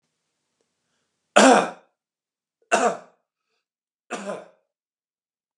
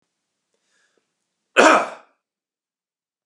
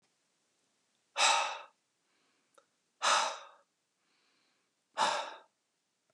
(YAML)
three_cough_length: 5.6 s
three_cough_amplitude: 31506
three_cough_signal_mean_std_ratio: 0.24
cough_length: 3.3 s
cough_amplitude: 32767
cough_signal_mean_std_ratio: 0.22
exhalation_length: 6.1 s
exhalation_amplitude: 6458
exhalation_signal_mean_std_ratio: 0.32
survey_phase: beta (2021-08-13 to 2022-03-07)
age: 18-44
gender: Male
wearing_mask: 'No'
symptom_none: true
smoker_status: Never smoked
respiratory_condition_asthma: false
respiratory_condition_other: false
recruitment_source: REACT
submission_delay: 1 day
covid_test_result: Negative
covid_test_method: RT-qPCR
influenza_a_test_result: Negative
influenza_b_test_result: Negative